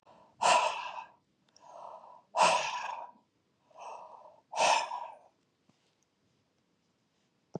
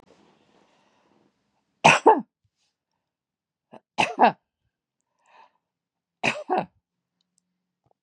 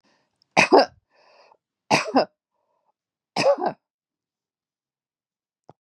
{"exhalation_length": "7.6 s", "exhalation_amplitude": 8284, "exhalation_signal_mean_std_ratio": 0.37, "three_cough_length": "8.0 s", "three_cough_amplitude": 31131, "three_cough_signal_mean_std_ratio": 0.22, "cough_length": "5.8 s", "cough_amplitude": 30570, "cough_signal_mean_std_ratio": 0.27, "survey_phase": "beta (2021-08-13 to 2022-03-07)", "age": "65+", "gender": "Female", "wearing_mask": "No", "symptom_none": true, "smoker_status": "Never smoked", "respiratory_condition_asthma": false, "respiratory_condition_other": false, "recruitment_source": "REACT", "submission_delay": "2 days", "covid_test_result": "Negative", "covid_test_method": "RT-qPCR", "influenza_a_test_result": "Negative", "influenza_b_test_result": "Negative"}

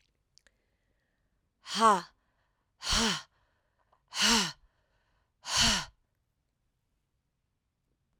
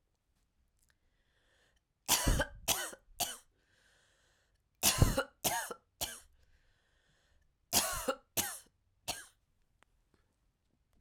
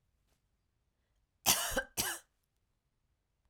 {"exhalation_length": "8.2 s", "exhalation_amplitude": 9403, "exhalation_signal_mean_std_ratio": 0.31, "three_cough_length": "11.0 s", "three_cough_amplitude": 8287, "three_cough_signal_mean_std_ratio": 0.32, "cough_length": "3.5 s", "cough_amplitude": 7712, "cough_signal_mean_std_ratio": 0.29, "survey_phase": "alpha (2021-03-01 to 2021-08-12)", "age": "45-64", "gender": "Female", "wearing_mask": "No", "symptom_cough_any": true, "symptom_abdominal_pain": true, "symptom_fatigue": true, "symptom_headache": true, "symptom_change_to_sense_of_smell_or_taste": true, "symptom_loss_of_taste": true, "smoker_status": "Never smoked", "respiratory_condition_asthma": false, "respiratory_condition_other": false, "recruitment_source": "Test and Trace", "submission_delay": "2 days", "covid_test_result": "Positive", "covid_test_method": "LFT"}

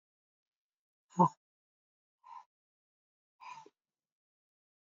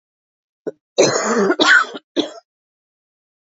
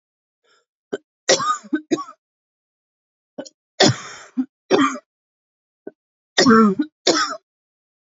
{"exhalation_length": "4.9 s", "exhalation_amplitude": 7240, "exhalation_signal_mean_std_ratio": 0.13, "cough_length": "3.4 s", "cough_amplitude": 32321, "cough_signal_mean_std_ratio": 0.43, "three_cough_length": "8.2 s", "three_cough_amplitude": 32768, "three_cough_signal_mean_std_ratio": 0.35, "survey_phase": "beta (2021-08-13 to 2022-03-07)", "age": "45-64", "gender": "Female", "wearing_mask": "No", "symptom_cough_any": true, "symptom_runny_or_blocked_nose": true, "symptom_fever_high_temperature": true, "smoker_status": "Ex-smoker", "respiratory_condition_asthma": false, "respiratory_condition_other": false, "recruitment_source": "Test and Trace", "submission_delay": "1 day", "covid_test_result": "Positive", "covid_test_method": "RT-qPCR"}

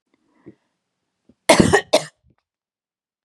{"cough_length": "3.2 s", "cough_amplitude": 32768, "cough_signal_mean_std_ratio": 0.25, "survey_phase": "beta (2021-08-13 to 2022-03-07)", "age": "45-64", "gender": "Female", "wearing_mask": "No", "symptom_none": true, "smoker_status": "Ex-smoker", "respiratory_condition_asthma": false, "respiratory_condition_other": false, "recruitment_source": "REACT", "submission_delay": "2 days", "covid_test_result": "Negative", "covid_test_method": "RT-qPCR", "influenza_a_test_result": "Negative", "influenza_b_test_result": "Negative"}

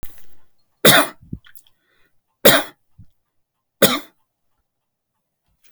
{"three_cough_length": "5.7 s", "three_cough_amplitude": 32768, "three_cough_signal_mean_std_ratio": 0.27, "survey_phase": "beta (2021-08-13 to 2022-03-07)", "age": "45-64", "gender": "Male", "wearing_mask": "No", "symptom_none": true, "smoker_status": "Never smoked", "respiratory_condition_asthma": false, "respiratory_condition_other": false, "recruitment_source": "REACT", "submission_delay": "3 days", "covid_test_result": "Negative", "covid_test_method": "RT-qPCR"}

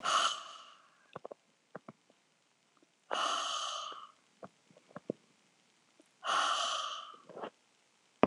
{"exhalation_length": "8.3 s", "exhalation_amplitude": 15740, "exhalation_signal_mean_std_ratio": 0.4, "survey_phase": "beta (2021-08-13 to 2022-03-07)", "age": "65+", "gender": "Female", "wearing_mask": "No", "symptom_none": true, "smoker_status": "Ex-smoker", "respiratory_condition_asthma": false, "respiratory_condition_other": false, "recruitment_source": "REACT", "submission_delay": "2 days", "covid_test_result": "Negative", "covid_test_method": "RT-qPCR", "influenza_a_test_result": "Negative", "influenza_b_test_result": "Negative"}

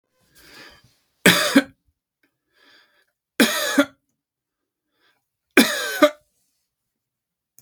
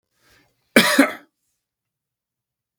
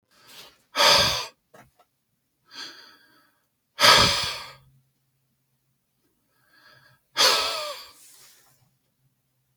{"three_cough_length": "7.6 s", "three_cough_amplitude": 32768, "three_cough_signal_mean_std_ratio": 0.28, "cough_length": "2.8 s", "cough_amplitude": 32768, "cough_signal_mean_std_ratio": 0.25, "exhalation_length": "9.6 s", "exhalation_amplitude": 28630, "exhalation_signal_mean_std_ratio": 0.31, "survey_phase": "beta (2021-08-13 to 2022-03-07)", "age": "45-64", "gender": "Male", "wearing_mask": "No", "symptom_none": true, "smoker_status": "Ex-smoker", "respiratory_condition_asthma": false, "respiratory_condition_other": false, "recruitment_source": "REACT", "submission_delay": "2 days", "covid_test_result": "Negative", "covid_test_method": "RT-qPCR", "influenza_a_test_result": "Negative", "influenza_b_test_result": "Negative"}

